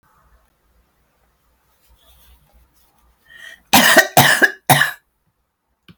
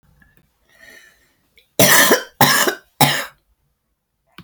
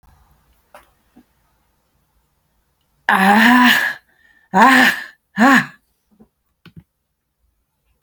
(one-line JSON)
{"cough_length": "6.0 s", "cough_amplitude": 32768, "cough_signal_mean_std_ratio": 0.3, "three_cough_length": "4.4 s", "three_cough_amplitude": 32768, "three_cough_signal_mean_std_ratio": 0.37, "exhalation_length": "8.0 s", "exhalation_amplitude": 32767, "exhalation_signal_mean_std_ratio": 0.36, "survey_phase": "alpha (2021-03-01 to 2021-08-12)", "age": "45-64", "gender": "Female", "wearing_mask": "No", "symptom_cough_any": true, "smoker_status": "Current smoker (1 to 10 cigarettes per day)", "respiratory_condition_asthma": true, "respiratory_condition_other": true, "recruitment_source": "REACT", "submission_delay": "1 day", "covid_test_result": "Negative", "covid_test_method": "RT-qPCR"}